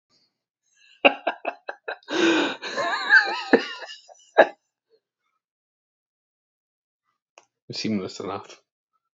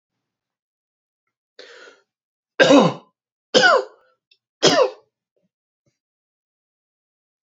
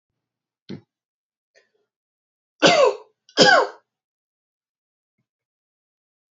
{"exhalation_length": "9.1 s", "exhalation_amplitude": 28498, "exhalation_signal_mean_std_ratio": 0.33, "three_cough_length": "7.4 s", "three_cough_amplitude": 31778, "three_cough_signal_mean_std_ratio": 0.27, "cough_length": "6.4 s", "cough_amplitude": 32312, "cough_signal_mean_std_ratio": 0.25, "survey_phase": "beta (2021-08-13 to 2022-03-07)", "age": "18-44", "gender": "Male", "wearing_mask": "No", "symptom_none": true, "smoker_status": "Ex-smoker", "respiratory_condition_asthma": false, "respiratory_condition_other": false, "recruitment_source": "REACT", "submission_delay": "2 days", "covid_test_result": "Negative", "covid_test_method": "RT-qPCR"}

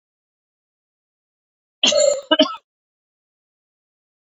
{"cough_length": "4.3 s", "cough_amplitude": 28068, "cough_signal_mean_std_ratio": 0.27, "survey_phase": "beta (2021-08-13 to 2022-03-07)", "age": "45-64", "gender": "Female", "wearing_mask": "No", "symptom_runny_or_blocked_nose": true, "symptom_shortness_of_breath": true, "symptom_fatigue": true, "symptom_headache": true, "symptom_change_to_sense_of_smell_or_taste": true, "smoker_status": "Never smoked", "respiratory_condition_asthma": false, "respiratory_condition_other": false, "recruitment_source": "Test and Trace", "submission_delay": "3 days", "covid_test_result": "Positive", "covid_test_method": "RT-qPCR", "covid_ct_value": 15.5, "covid_ct_gene": "ORF1ab gene", "covid_ct_mean": 15.9, "covid_viral_load": "6300000 copies/ml", "covid_viral_load_category": "High viral load (>1M copies/ml)"}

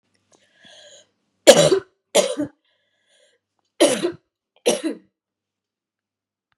{"three_cough_length": "6.6 s", "three_cough_amplitude": 32768, "three_cough_signal_mean_std_ratio": 0.28, "survey_phase": "beta (2021-08-13 to 2022-03-07)", "age": "45-64", "gender": "Female", "wearing_mask": "No", "symptom_cough_any": true, "symptom_sore_throat": true, "symptom_abdominal_pain": true, "symptom_fatigue": true, "symptom_headache": true, "symptom_change_to_sense_of_smell_or_taste": true, "symptom_loss_of_taste": true, "symptom_onset": "2 days", "smoker_status": "Ex-smoker", "respiratory_condition_asthma": false, "respiratory_condition_other": false, "recruitment_source": "Test and Trace", "submission_delay": "2 days", "covid_test_result": "Positive", "covid_test_method": "RT-qPCR", "covid_ct_value": 17.3, "covid_ct_gene": "ORF1ab gene", "covid_ct_mean": 18.3, "covid_viral_load": "970000 copies/ml", "covid_viral_load_category": "Low viral load (10K-1M copies/ml)"}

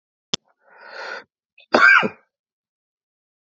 {"cough_length": "3.6 s", "cough_amplitude": 27507, "cough_signal_mean_std_ratio": 0.27, "survey_phase": "alpha (2021-03-01 to 2021-08-12)", "age": "18-44", "gender": "Male", "wearing_mask": "No", "symptom_cough_any": true, "symptom_fatigue": true, "symptom_headache": true, "symptom_change_to_sense_of_smell_or_taste": true, "symptom_loss_of_taste": true, "smoker_status": "Never smoked", "respiratory_condition_asthma": false, "respiratory_condition_other": false, "recruitment_source": "Test and Trace", "submission_delay": "2 days", "covid_test_result": "Positive", "covid_test_method": "RT-qPCR", "covid_ct_value": 13.1, "covid_ct_gene": "ORF1ab gene", "covid_ct_mean": 13.4, "covid_viral_load": "39000000 copies/ml", "covid_viral_load_category": "High viral load (>1M copies/ml)"}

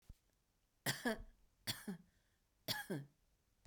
{"three_cough_length": "3.7 s", "three_cough_amplitude": 1646, "three_cough_signal_mean_std_ratio": 0.38, "survey_phase": "beta (2021-08-13 to 2022-03-07)", "age": "45-64", "gender": "Female", "wearing_mask": "No", "symptom_none": true, "smoker_status": "Ex-smoker", "respiratory_condition_asthma": false, "respiratory_condition_other": false, "recruitment_source": "REACT", "submission_delay": "1 day", "covid_test_result": "Negative", "covid_test_method": "RT-qPCR"}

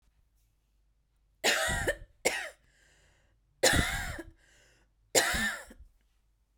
{"three_cough_length": "6.6 s", "three_cough_amplitude": 10788, "three_cough_signal_mean_std_ratio": 0.4, "survey_phase": "beta (2021-08-13 to 2022-03-07)", "age": "45-64", "gender": "Female", "wearing_mask": "No", "symptom_none": true, "smoker_status": "Ex-smoker", "respiratory_condition_asthma": false, "respiratory_condition_other": false, "recruitment_source": "REACT", "submission_delay": "2 days", "covid_test_result": "Negative", "covid_test_method": "RT-qPCR"}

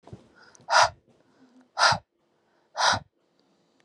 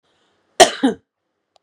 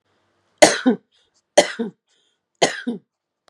{"exhalation_length": "3.8 s", "exhalation_amplitude": 19831, "exhalation_signal_mean_std_ratio": 0.32, "cough_length": "1.6 s", "cough_amplitude": 32768, "cough_signal_mean_std_ratio": 0.25, "three_cough_length": "3.5 s", "three_cough_amplitude": 32768, "three_cough_signal_mean_std_ratio": 0.28, "survey_phase": "beta (2021-08-13 to 2022-03-07)", "age": "18-44", "gender": "Female", "wearing_mask": "No", "symptom_none": true, "smoker_status": "Current smoker (1 to 10 cigarettes per day)", "respiratory_condition_asthma": false, "respiratory_condition_other": false, "recruitment_source": "REACT", "submission_delay": "1 day", "covid_test_result": "Negative", "covid_test_method": "RT-qPCR", "influenza_a_test_result": "Negative", "influenza_b_test_result": "Negative"}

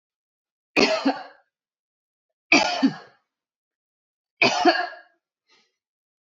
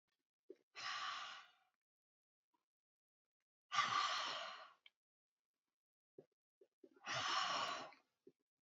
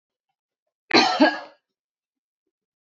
{"three_cough_length": "6.3 s", "three_cough_amplitude": 24348, "three_cough_signal_mean_std_ratio": 0.33, "exhalation_length": "8.6 s", "exhalation_amplitude": 1788, "exhalation_signal_mean_std_ratio": 0.41, "cough_length": "2.8 s", "cough_amplitude": 26205, "cough_signal_mean_std_ratio": 0.29, "survey_phase": "beta (2021-08-13 to 2022-03-07)", "age": "18-44", "gender": "Female", "wearing_mask": "No", "symptom_none": true, "smoker_status": "Never smoked", "respiratory_condition_asthma": false, "respiratory_condition_other": false, "recruitment_source": "REACT", "submission_delay": "1 day", "covid_test_result": "Negative", "covid_test_method": "RT-qPCR"}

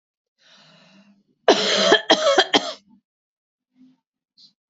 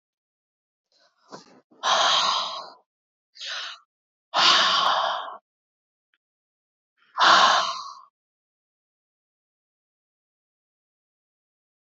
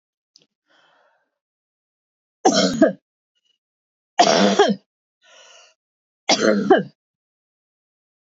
{"cough_length": "4.7 s", "cough_amplitude": 32767, "cough_signal_mean_std_ratio": 0.35, "exhalation_length": "11.9 s", "exhalation_amplitude": 20554, "exhalation_signal_mean_std_ratio": 0.35, "three_cough_length": "8.3 s", "three_cough_amplitude": 27071, "three_cough_signal_mean_std_ratio": 0.33, "survey_phase": "beta (2021-08-13 to 2022-03-07)", "age": "45-64", "gender": "Female", "wearing_mask": "No", "symptom_none": true, "smoker_status": "Never smoked", "respiratory_condition_asthma": false, "respiratory_condition_other": false, "recruitment_source": "REACT", "submission_delay": "3 days", "covid_test_result": "Negative", "covid_test_method": "RT-qPCR", "influenza_a_test_result": "Negative", "influenza_b_test_result": "Negative"}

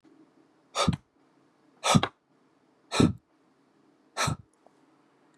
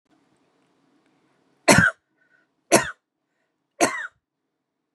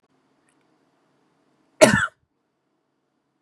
{"exhalation_length": "5.4 s", "exhalation_amplitude": 15872, "exhalation_signal_mean_std_ratio": 0.28, "three_cough_length": "4.9 s", "three_cough_amplitude": 32767, "three_cough_signal_mean_std_ratio": 0.24, "cough_length": "3.4 s", "cough_amplitude": 32767, "cough_signal_mean_std_ratio": 0.19, "survey_phase": "beta (2021-08-13 to 2022-03-07)", "age": "18-44", "gender": "Female", "wearing_mask": "No", "symptom_none": true, "smoker_status": "Never smoked", "respiratory_condition_asthma": false, "respiratory_condition_other": false, "recruitment_source": "REACT", "submission_delay": "1 day", "covid_test_result": "Negative", "covid_test_method": "RT-qPCR", "influenza_a_test_result": "Negative", "influenza_b_test_result": "Negative"}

